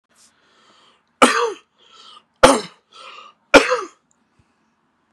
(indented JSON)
{
  "three_cough_length": "5.1 s",
  "three_cough_amplitude": 32768,
  "three_cough_signal_mean_std_ratio": 0.27,
  "survey_phase": "beta (2021-08-13 to 2022-03-07)",
  "age": "18-44",
  "gender": "Male",
  "wearing_mask": "No",
  "symptom_cough_any": true,
  "symptom_headache": true,
  "smoker_status": "Never smoked",
  "respiratory_condition_asthma": false,
  "respiratory_condition_other": false,
  "recruitment_source": "Test and Trace",
  "submission_delay": "2 days",
  "covid_test_result": "Positive",
  "covid_test_method": "RT-qPCR",
  "covid_ct_value": 20.2,
  "covid_ct_gene": "ORF1ab gene",
  "covid_ct_mean": 20.6,
  "covid_viral_load": "180000 copies/ml",
  "covid_viral_load_category": "Low viral load (10K-1M copies/ml)"
}